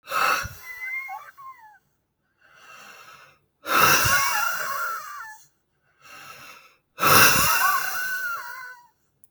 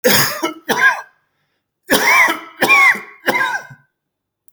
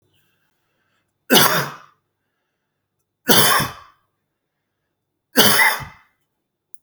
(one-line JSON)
{"exhalation_length": "9.3 s", "exhalation_amplitude": 26873, "exhalation_signal_mean_std_ratio": 0.5, "cough_length": "4.5 s", "cough_amplitude": 32767, "cough_signal_mean_std_ratio": 0.55, "three_cough_length": "6.8 s", "three_cough_amplitude": 32768, "three_cough_signal_mean_std_ratio": 0.33, "survey_phase": "beta (2021-08-13 to 2022-03-07)", "age": "45-64", "gender": "Male", "wearing_mask": "No", "symptom_none": true, "smoker_status": "Ex-smoker", "respiratory_condition_asthma": false, "respiratory_condition_other": false, "recruitment_source": "REACT", "submission_delay": "2 days", "covid_test_result": "Negative", "covid_test_method": "RT-qPCR", "influenza_a_test_result": "Negative", "influenza_b_test_result": "Negative"}